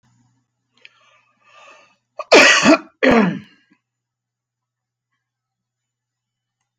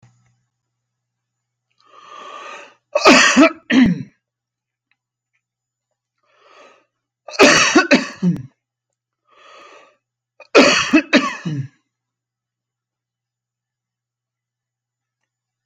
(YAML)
cough_length: 6.8 s
cough_amplitude: 32767
cough_signal_mean_std_ratio: 0.28
three_cough_length: 15.7 s
three_cough_amplitude: 32767
three_cough_signal_mean_std_ratio: 0.31
survey_phase: beta (2021-08-13 to 2022-03-07)
age: 45-64
gender: Male
wearing_mask: 'No'
symptom_sore_throat: true
symptom_onset: 5 days
smoker_status: Ex-smoker
respiratory_condition_asthma: true
respiratory_condition_other: false
recruitment_source: REACT
submission_delay: 1 day
covid_test_result: Negative
covid_test_method: RT-qPCR